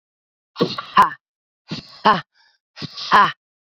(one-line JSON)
{"exhalation_length": "3.7 s", "exhalation_amplitude": 29188, "exhalation_signal_mean_std_ratio": 0.34, "survey_phase": "beta (2021-08-13 to 2022-03-07)", "age": "18-44", "gender": "Female", "wearing_mask": "No", "symptom_cough_any": true, "symptom_runny_or_blocked_nose": true, "symptom_abdominal_pain": true, "symptom_fatigue": true, "symptom_fever_high_temperature": true, "symptom_change_to_sense_of_smell_or_taste": true, "smoker_status": "Current smoker (1 to 10 cigarettes per day)", "respiratory_condition_asthma": true, "respiratory_condition_other": false, "recruitment_source": "Test and Trace", "submission_delay": "1 day", "covid_test_result": "Positive", "covid_test_method": "RT-qPCR"}